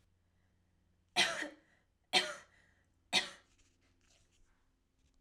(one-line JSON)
{"three_cough_length": "5.2 s", "three_cough_amplitude": 6297, "three_cough_signal_mean_std_ratio": 0.26, "survey_phase": "alpha (2021-03-01 to 2021-08-12)", "age": "18-44", "gender": "Female", "wearing_mask": "No", "symptom_none": true, "smoker_status": "Never smoked", "respiratory_condition_asthma": false, "respiratory_condition_other": false, "recruitment_source": "REACT", "submission_delay": "1 day", "covid_test_result": "Negative", "covid_test_method": "RT-qPCR"}